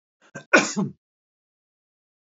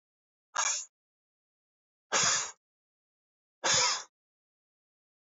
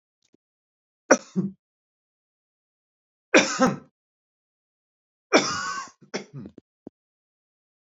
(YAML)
cough_length: 2.4 s
cough_amplitude: 28358
cough_signal_mean_std_ratio: 0.24
exhalation_length: 5.3 s
exhalation_amplitude: 6929
exhalation_signal_mean_std_ratio: 0.34
three_cough_length: 7.9 s
three_cough_amplitude: 24765
three_cough_signal_mean_std_ratio: 0.25
survey_phase: beta (2021-08-13 to 2022-03-07)
age: 45-64
gender: Male
wearing_mask: 'No'
symptom_none: true
smoker_status: Ex-smoker
respiratory_condition_asthma: false
respiratory_condition_other: false
recruitment_source: REACT
submission_delay: 1 day
covid_test_result: Negative
covid_test_method: RT-qPCR